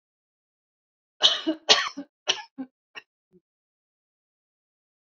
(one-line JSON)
{"cough_length": "5.1 s", "cough_amplitude": 27471, "cough_signal_mean_std_ratio": 0.23, "survey_phase": "beta (2021-08-13 to 2022-03-07)", "age": "45-64", "gender": "Female", "wearing_mask": "No", "symptom_none": true, "smoker_status": "Never smoked", "respiratory_condition_asthma": false, "respiratory_condition_other": false, "recruitment_source": "REACT", "submission_delay": "1 day", "covid_test_result": "Negative", "covid_test_method": "RT-qPCR"}